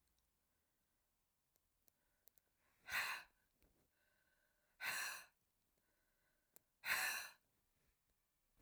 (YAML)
exhalation_length: 8.6 s
exhalation_amplitude: 1305
exhalation_signal_mean_std_ratio: 0.3
survey_phase: alpha (2021-03-01 to 2021-08-12)
age: 65+
gender: Female
wearing_mask: 'No'
symptom_none: true
smoker_status: Never smoked
respiratory_condition_asthma: false
respiratory_condition_other: false
recruitment_source: REACT
submission_delay: 2 days
covid_test_result: Negative
covid_test_method: RT-qPCR